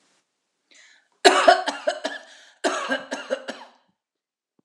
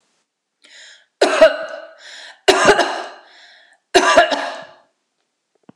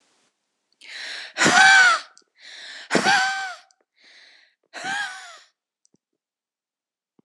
cough_length: 4.6 s
cough_amplitude: 26028
cough_signal_mean_std_ratio: 0.34
three_cough_length: 5.8 s
three_cough_amplitude: 26028
three_cough_signal_mean_std_ratio: 0.39
exhalation_length: 7.2 s
exhalation_amplitude: 23672
exhalation_signal_mean_std_ratio: 0.37
survey_phase: alpha (2021-03-01 to 2021-08-12)
age: 45-64
gender: Female
wearing_mask: 'No'
symptom_none: true
smoker_status: Ex-smoker
respiratory_condition_asthma: false
respiratory_condition_other: false
recruitment_source: REACT
submission_delay: 3 days
covid_test_result: Negative
covid_test_method: RT-qPCR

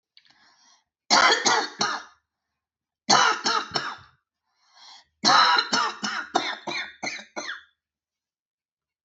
three_cough_length: 9.0 s
three_cough_amplitude: 20139
three_cough_signal_mean_std_ratio: 0.43
survey_phase: beta (2021-08-13 to 2022-03-07)
age: 45-64
gender: Female
wearing_mask: 'No'
symptom_runny_or_blocked_nose: true
symptom_abdominal_pain: true
symptom_onset: 12 days
smoker_status: Never smoked
respiratory_condition_asthma: true
respiratory_condition_other: false
recruitment_source: REACT
submission_delay: 2 days
covid_test_result: Negative
covid_test_method: RT-qPCR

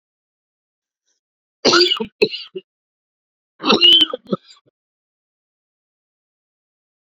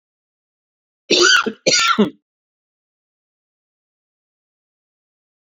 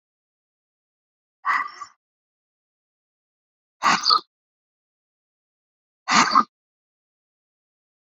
three_cough_length: 7.1 s
three_cough_amplitude: 32767
three_cough_signal_mean_std_ratio: 0.29
cough_length: 5.5 s
cough_amplitude: 29113
cough_signal_mean_std_ratio: 0.3
exhalation_length: 8.1 s
exhalation_amplitude: 29400
exhalation_signal_mean_std_ratio: 0.25
survey_phase: beta (2021-08-13 to 2022-03-07)
age: 45-64
gender: Male
wearing_mask: 'No'
symptom_cough_any: true
symptom_new_continuous_cough: true
symptom_runny_or_blocked_nose: true
symptom_sore_throat: true
symptom_diarrhoea: true
symptom_fatigue: true
symptom_fever_high_temperature: true
symptom_headache: true
symptom_change_to_sense_of_smell_or_taste: true
symptom_onset: 4 days
smoker_status: Never smoked
respiratory_condition_asthma: false
respiratory_condition_other: false
recruitment_source: Test and Trace
submission_delay: 1 day
covid_test_result: Positive
covid_test_method: RT-qPCR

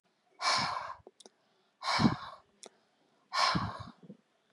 exhalation_length: 4.5 s
exhalation_amplitude: 7461
exhalation_signal_mean_std_ratio: 0.43
survey_phase: beta (2021-08-13 to 2022-03-07)
age: 45-64
gender: Female
wearing_mask: 'No'
symptom_none: true
smoker_status: Never smoked
respiratory_condition_asthma: false
respiratory_condition_other: false
recruitment_source: REACT
submission_delay: 0 days
covid_test_result: Negative
covid_test_method: RT-qPCR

